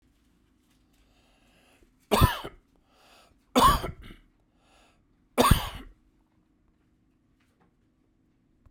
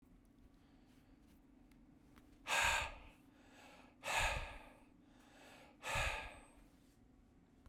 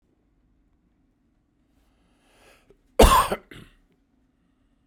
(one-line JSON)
{"three_cough_length": "8.7 s", "three_cough_amplitude": 19493, "three_cough_signal_mean_std_ratio": 0.25, "exhalation_length": "7.7 s", "exhalation_amplitude": 2354, "exhalation_signal_mean_std_ratio": 0.42, "cough_length": "4.9 s", "cough_amplitude": 32767, "cough_signal_mean_std_ratio": 0.2, "survey_phase": "beta (2021-08-13 to 2022-03-07)", "age": "45-64", "gender": "Male", "wearing_mask": "No", "symptom_runny_or_blocked_nose": true, "symptom_sore_throat": true, "symptom_fatigue": true, "symptom_change_to_sense_of_smell_or_taste": true, "symptom_loss_of_taste": true, "symptom_onset": "3 days", "smoker_status": "Never smoked", "respiratory_condition_asthma": false, "respiratory_condition_other": false, "recruitment_source": "Test and Trace", "submission_delay": "1 day", "covid_test_result": "Positive", "covid_test_method": "RT-qPCR", "covid_ct_value": 15.1, "covid_ct_gene": "ORF1ab gene", "covid_ct_mean": 15.6, "covid_viral_load": "7900000 copies/ml", "covid_viral_load_category": "High viral load (>1M copies/ml)"}